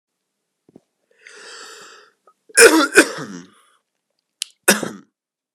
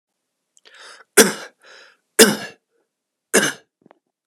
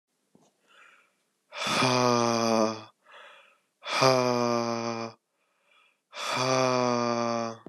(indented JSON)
{
  "cough_length": "5.5 s",
  "cough_amplitude": 32768,
  "cough_signal_mean_std_ratio": 0.26,
  "three_cough_length": "4.3 s",
  "three_cough_amplitude": 32768,
  "three_cough_signal_mean_std_ratio": 0.25,
  "exhalation_length": "7.7 s",
  "exhalation_amplitude": 15434,
  "exhalation_signal_mean_std_ratio": 0.55,
  "survey_phase": "beta (2021-08-13 to 2022-03-07)",
  "age": "18-44",
  "gender": "Male",
  "wearing_mask": "No",
  "symptom_cough_any": true,
  "symptom_runny_or_blocked_nose": true,
  "symptom_fatigue": true,
  "symptom_onset": "3 days",
  "smoker_status": "Never smoked",
  "respiratory_condition_asthma": true,
  "respiratory_condition_other": false,
  "recruitment_source": "Test and Trace",
  "submission_delay": "2 days",
  "covid_test_result": "Negative",
  "covid_test_method": "RT-qPCR"
}